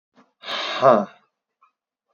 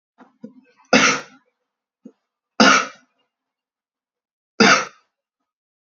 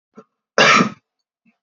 {"exhalation_length": "2.1 s", "exhalation_amplitude": 26197, "exhalation_signal_mean_std_ratio": 0.33, "three_cough_length": "5.8 s", "three_cough_amplitude": 29894, "three_cough_signal_mean_std_ratio": 0.28, "cough_length": "1.6 s", "cough_amplitude": 31430, "cough_signal_mean_std_ratio": 0.36, "survey_phase": "beta (2021-08-13 to 2022-03-07)", "age": "18-44", "gender": "Male", "wearing_mask": "No", "symptom_cough_any": true, "symptom_sore_throat": true, "symptom_onset": "6 days", "smoker_status": "Never smoked", "respiratory_condition_asthma": false, "respiratory_condition_other": false, "recruitment_source": "REACT", "submission_delay": "1 day", "covid_test_result": "Negative", "covid_test_method": "RT-qPCR"}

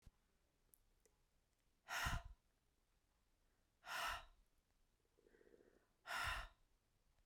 {"exhalation_length": "7.3 s", "exhalation_amplitude": 911, "exhalation_signal_mean_std_ratio": 0.35, "survey_phase": "beta (2021-08-13 to 2022-03-07)", "age": "18-44", "gender": "Male", "wearing_mask": "No", "symptom_cough_any": true, "symptom_new_continuous_cough": true, "symptom_runny_or_blocked_nose": true, "symptom_shortness_of_breath": true, "symptom_sore_throat": true, "symptom_fatigue": true, "symptom_headache": true, "symptom_change_to_sense_of_smell_or_taste": true, "symptom_loss_of_taste": true, "symptom_onset": "6 days", "smoker_status": "Ex-smoker", "respiratory_condition_asthma": false, "respiratory_condition_other": false, "recruitment_source": "Test and Trace", "submission_delay": "2 days", "covid_test_method": "RT-qPCR"}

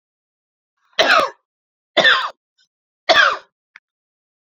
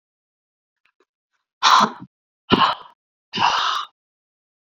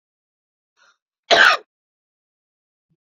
{"three_cough_length": "4.4 s", "three_cough_amplitude": 30700, "three_cough_signal_mean_std_ratio": 0.35, "exhalation_length": "4.7 s", "exhalation_amplitude": 26703, "exhalation_signal_mean_std_ratio": 0.35, "cough_length": "3.1 s", "cough_amplitude": 28598, "cough_signal_mean_std_ratio": 0.23, "survey_phase": "beta (2021-08-13 to 2022-03-07)", "age": "18-44", "gender": "Female", "wearing_mask": "No", "symptom_runny_or_blocked_nose": true, "symptom_sore_throat": true, "symptom_abdominal_pain": true, "symptom_diarrhoea": true, "symptom_fatigue": true, "symptom_headache": true, "symptom_other": true, "smoker_status": "Never smoked", "respiratory_condition_asthma": false, "respiratory_condition_other": false, "recruitment_source": "Test and Trace", "submission_delay": "2 days", "covid_test_result": "Positive", "covid_test_method": "RT-qPCR"}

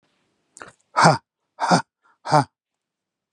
{"exhalation_length": "3.3 s", "exhalation_amplitude": 30805, "exhalation_signal_mean_std_ratio": 0.3, "survey_phase": "beta (2021-08-13 to 2022-03-07)", "age": "45-64", "gender": "Male", "wearing_mask": "No", "symptom_none": true, "symptom_onset": "12 days", "smoker_status": "Never smoked", "respiratory_condition_asthma": false, "respiratory_condition_other": false, "recruitment_source": "REACT", "submission_delay": "2 days", "covid_test_result": "Negative", "covid_test_method": "RT-qPCR", "influenza_a_test_result": "Negative", "influenza_b_test_result": "Negative"}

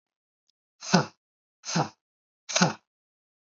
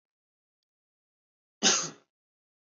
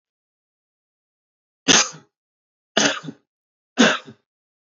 {"exhalation_length": "3.5 s", "exhalation_amplitude": 24086, "exhalation_signal_mean_std_ratio": 0.29, "cough_length": "2.7 s", "cough_amplitude": 10833, "cough_signal_mean_std_ratio": 0.22, "three_cough_length": "4.8 s", "three_cough_amplitude": 31819, "three_cough_signal_mean_std_ratio": 0.27, "survey_phase": "beta (2021-08-13 to 2022-03-07)", "age": "18-44", "gender": "Male", "wearing_mask": "No", "symptom_cough_any": true, "symptom_runny_or_blocked_nose": true, "symptom_onset": "5 days", "smoker_status": "Never smoked", "respiratory_condition_asthma": false, "respiratory_condition_other": false, "recruitment_source": "REACT", "submission_delay": "1 day", "covid_test_result": "Negative", "covid_test_method": "RT-qPCR", "influenza_a_test_result": "Negative", "influenza_b_test_result": "Negative"}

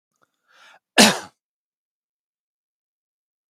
{"cough_length": "3.5 s", "cough_amplitude": 32768, "cough_signal_mean_std_ratio": 0.17, "survey_phase": "beta (2021-08-13 to 2022-03-07)", "age": "65+", "gender": "Male", "wearing_mask": "No", "symptom_runny_or_blocked_nose": true, "symptom_onset": "2 days", "smoker_status": "Never smoked", "respiratory_condition_asthma": false, "respiratory_condition_other": false, "recruitment_source": "Test and Trace", "submission_delay": "1 day", "covid_test_result": "Positive", "covid_test_method": "RT-qPCR", "covid_ct_value": 22.9, "covid_ct_gene": "N gene"}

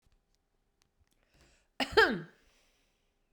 {"cough_length": "3.3 s", "cough_amplitude": 10251, "cough_signal_mean_std_ratio": 0.22, "survey_phase": "beta (2021-08-13 to 2022-03-07)", "age": "65+", "gender": "Female", "wearing_mask": "No", "symptom_none": true, "smoker_status": "Ex-smoker", "respiratory_condition_asthma": false, "respiratory_condition_other": false, "recruitment_source": "REACT", "submission_delay": "2 days", "covid_test_result": "Negative", "covid_test_method": "RT-qPCR"}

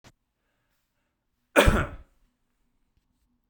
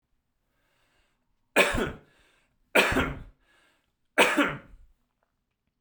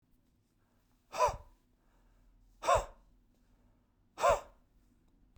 {"cough_length": "3.5 s", "cough_amplitude": 24771, "cough_signal_mean_std_ratio": 0.22, "three_cough_length": "5.8 s", "three_cough_amplitude": 19526, "three_cough_signal_mean_std_ratio": 0.33, "exhalation_length": "5.4 s", "exhalation_amplitude": 5603, "exhalation_signal_mean_std_ratio": 0.27, "survey_phase": "beta (2021-08-13 to 2022-03-07)", "age": "45-64", "gender": "Male", "wearing_mask": "No", "symptom_none": true, "smoker_status": "Ex-smoker", "respiratory_condition_asthma": false, "respiratory_condition_other": false, "recruitment_source": "REACT", "submission_delay": "2 days", "covid_test_result": "Negative", "covid_test_method": "RT-qPCR"}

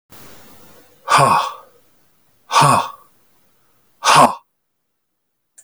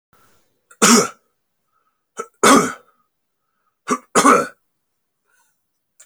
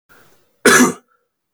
{"exhalation_length": "5.6 s", "exhalation_amplitude": 31860, "exhalation_signal_mean_std_ratio": 0.36, "three_cough_length": "6.1 s", "three_cough_amplitude": 31521, "three_cough_signal_mean_std_ratio": 0.31, "cough_length": "1.5 s", "cough_amplitude": 32767, "cough_signal_mean_std_ratio": 0.36, "survey_phase": "beta (2021-08-13 to 2022-03-07)", "age": "45-64", "gender": "Male", "wearing_mask": "No", "symptom_cough_any": true, "symptom_runny_or_blocked_nose": true, "symptom_fatigue": true, "symptom_headache": true, "symptom_onset": "3 days", "smoker_status": "Never smoked", "respiratory_condition_asthma": false, "respiratory_condition_other": false, "recruitment_source": "Test and Trace", "submission_delay": "1 day", "covid_test_result": "Positive", "covid_test_method": "RT-qPCR", "covid_ct_value": 21.1, "covid_ct_gene": "ORF1ab gene"}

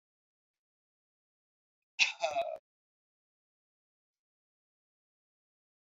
{"cough_length": "6.0 s", "cough_amplitude": 9452, "cough_signal_mean_std_ratio": 0.19, "survey_phase": "beta (2021-08-13 to 2022-03-07)", "age": "65+", "gender": "Male", "wearing_mask": "No", "symptom_cough_any": true, "symptom_runny_or_blocked_nose": true, "symptom_sore_throat": true, "symptom_fatigue": true, "symptom_other": true, "smoker_status": "Never smoked", "respiratory_condition_asthma": false, "respiratory_condition_other": false, "recruitment_source": "Test and Trace", "submission_delay": "2 days", "covid_test_result": "Positive", "covid_test_method": "RT-qPCR", "covid_ct_value": 18.3, "covid_ct_gene": "ORF1ab gene", "covid_ct_mean": 18.7, "covid_viral_load": "730000 copies/ml", "covid_viral_load_category": "Low viral load (10K-1M copies/ml)"}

